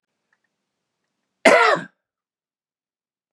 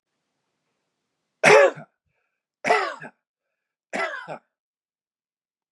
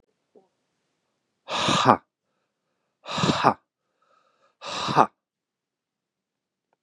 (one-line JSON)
{"cough_length": "3.3 s", "cough_amplitude": 32768, "cough_signal_mean_std_ratio": 0.25, "three_cough_length": "5.7 s", "three_cough_amplitude": 26394, "three_cough_signal_mean_std_ratio": 0.26, "exhalation_length": "6.8 s", "exhalation_amplitude": 32458, "exhalation_signal_mean_std_ratio": 0.28, "survey_phase": "beta (2021-08-13 to 2022-03-07)", "age": "45-64", "gender": "Male", "wearing_mask": "No", "symptom_none": true, "symptom_onset": "2 days", "smoker_status": "Never smoked", "respiratory_condition_asthma": false, "respiratory_condition_other": false, "recruitment_source": "REACT", "submission_delay": "2 days", "covid_test_result": "Negative", "covid_test_method": "RT-qPCR", "influenza_a_test_result": "Negative", "influenza_b_test_result": "Negative"}